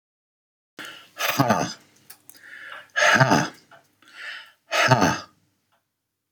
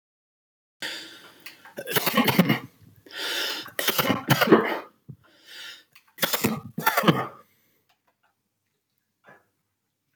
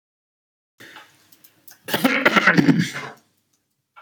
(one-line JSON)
{"exhalation_length": "6.3 s", "exhalation_amplitude": 23787, "exhalation_signal_mean_std_ratio": 0.41, "three_cough_length": "10.2 s", "three_cough_amplitude": 27470, "three_cough_signal_mean_std_ratio": 0.4, "cough_length": "4.0 s", "cough_amplitude": 26978, "cough_signal_mean_std_ratio": 0.38, "survey_phase": "beta (2021-08-13 to 2022-03-07)", "age": "45-64", "gender": "Male", "wearing_mask": "No", "symptom_none": true, "smoker_status": "Never smoked", "respiratory_condition_asthma": false, "respiratory_condition_other": false, "recruitment_source": "REACT", "submission_delay": "1 day", "covid_test_result": "Negative", "covid_test_method": "RT-qPCR"}